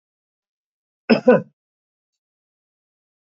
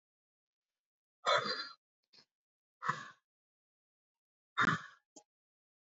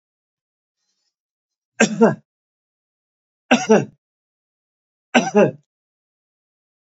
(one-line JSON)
{"cough_length": "3.3 s", "cough_amplitude": 29216, "cough_signal_mean_std_ratio": 0.2, "exhalation_length": "5.8 s", "exhalation_amplitude": 3741, "exhalation_signal_mean_std_ratio": 0.27, "three_cough_length": "7.0 s", "three_cough_amplitude": 29380, "three_cough_signal_mean_std_ratio": 0.26, "survey_phase": "beta (2021-08-13 to 2022-03-07)", "age": "45-64", "gender": "Male", "wearing_mask": "No", "symptom_none": true, "smoker_status": "Current smoker (e-cigarettes or vapes only)", "respiratory_condition_asthma": false, "respiratory_condition_other": false, "recruitment_source": "REACT", "submission_delay": "2 days", "covid_test_result": "Negative", "covid_test_method": "RT-qPCR"}